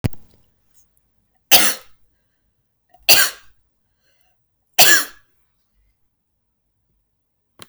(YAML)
three_cough_length: 7.7 s
three_cough_amplitude: 32768
three_cough_signal_mean_std_ratio: 0.25
survey_phase: beta (2021-08-13 to 2022-03-07)
age: 18-44
gender: Female
wearing_mask: 'No'
symptom_none: true
smoker_status: Never smoked
respiratory_condition_asthma: false
respiratory_condition_other: false
recruitment_source: Test and Trace
submission_delay: 1 day
covid_test_result: Negative
covid_test_method: RT-qPCR